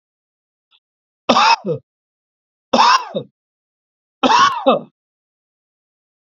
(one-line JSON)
{"three_cough_length": "6.4 s", "three_cough_amplitude": 29106, "three_cough_signal_mean_std_ratio": 0.35, "survey_phase": "beta (2021-08-13 to 2022-03-07)", "age": "65+", "gender": "Male", "wearing_mask": "No", "symptom_cough_any": true, "symptom_headache": true, "smoker_status": "Ex-smoker", "respiratory_condition_asthma": false, "respiratory_condition_other": false, "recruitment_source": "REACT", "submission_delay": "1 day", "covid_test_result": "Negative", "covid_test_method": "RT-qPCR", "influenza_a_test_result": "Negative", "influenza_b_test_result": "Negative"}